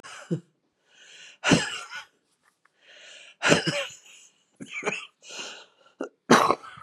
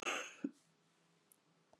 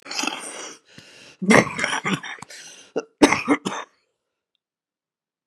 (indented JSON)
{
  "exhalation_length": "6.8 s",
  "exhalation_amplitude": 26377,
  "exhalation_signal_mean_std_ratio": 0.34,
  "cough_length": "1.8 s",
  "cough_amplitude": 1491,
  "cough_signal_mean_std_ratio": 0.36,
  "three_cough_length": "5.5 s",
  "three_cough_amplitude": 32767,
  "three_cough_signal_mean_std_ratio": 0.36,
  "survey_phase": "beta (2021-08-13 to 2022-03-07)",
  "age": "45-64",
  "gender": "Female",
  "wearing_mask": "No",
  "symptom_cough_any": true,
  "symptom_runny_or_blocked_nose": true,
  "symptom_sore_throat": true,
  "symptom_fatigue": true,
  "symptom_onset": "4 days",
  "smoker_status": "Ex-smoker",
  "respiratory_condition_asthma": true,
  "respiratory_condition_other": true,
  "recruitment_source": "Test and Trace",
  "submission_delay": "2 days",
  "covid_test_result": "Positive",
  "covid_test_method": "RT-qPCR",
  "covid_ct_value": 17.9,
  "covid_ct_gene": "ORF1ab gene",
  "covid_ct_mean": 18.2,
  "covid_viral_load": "1100000 copies/ml",
  "covid_viral_load_category": "High viral load (>1M copies/ml)"
}